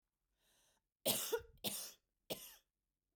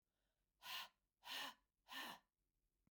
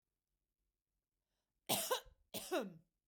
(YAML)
three_cough_length: 3.2 s
three_cough_amplitude: 3846
three_cough_signal_mean_std_ratio: 0.36
exhalation_length: 2.9 s
exhalation_amplitude: 357
exhalation_signal_mean_std_ratio: 0.44
cough_length: 3.1 s
cough_amplitude: 2525
cough_signal_mean_std_ratio: 0.34
survey_phase: beta (2021-08-13 to 2022-03-07)
age: 45-64
gender: Female
wearing_mask: 'No'
symptom_none: true
smoker_status: Never smoked
respiratory_condition_asthma: false
respiratory_condition_other: false
recruitment_source: REACT
submission_delay: 1 day
covid_test_result: Negative
covid_test_method: RT-qPCR
influenza_a_test_result: Negative
influenza_b_test_result: Negative